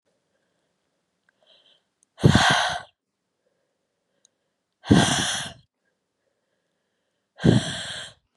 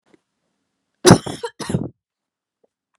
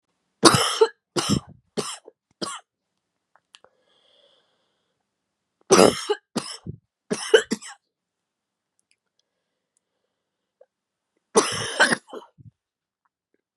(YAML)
exhalation_length: 8.4 s
exhalation_amplitude: 25650
exhalation_signal_mean_std_ratio: 0.3
cough_length: 3.0 s
cough_amplitude: 32768
cough_signal_mean_std_ratio: 0.23
three_cough_length: 13.6 s
three_cough_amplitude: 32768
three_cough_signal_mean_std_ratio: 0.26
survey_phase: beta (2021-08-13 to 2022-03-07)
age: 18-44
gender: Female
wearing_mask: 'No'
symptom_new_continuous_cough: true
symptom_runny_or_blocked_nose: true
symptom_sore_throat: true
symptom_fatigue: true
symptom_fever_high_temperature: true
symptom_headache: true
symptom_other: true
symptom_onset: 3 days
smoker_status: Never smoked
respiratory_condition_asthma: false
respiratory_condition_other: false
recruitment_source: Test and Trace
submission_delay: 1 day
covid_test_result: Positive
covid_test_method: RT-qPCR
covid_ct_value: 27.0
covid_ct_gene: ORF1ab gene